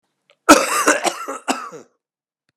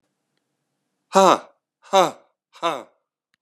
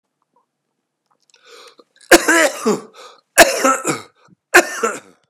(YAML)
cough_length: 2.6 s
cough_amplitude: 32768
cough_signal_mean_std_ratio: 0.38
exhalation_length: 3.4 s
exhalation_amplitude: 31180
exhalation_signal_mean_std_ratio: 0.27
three_cough_length: 5.3 s
three_cough_amplitude: 32768
three_cough_signal_mean_std_ratio: 0.36
survey_phase: beta (2021-08-13 to 2022-03-07)
age: 45-64
gender: Male
wearing_mask: 'No'
symptom_cough_any: true
symptom_new_continuous_cough: true
symptom_runny_or_blocked_nose: true
symptom_sore_throat: true
symptom_diarrhoea: true
symptom_fatigue: true
symptom_fever_high_temperature: true
symptom_headache: true
symptom_onset: 3 days
smoker_status: Ex-smoker
respiratory_condition_asthma: false
respiratory_condition_other: false
recruitment_source: Test and Trace
submission_delay: 2 days
covid_test_result: Positive
covid_test_method: RT-qPCR
covid_ct_value: 23.4
covid_ct_gene: ORF1ab gene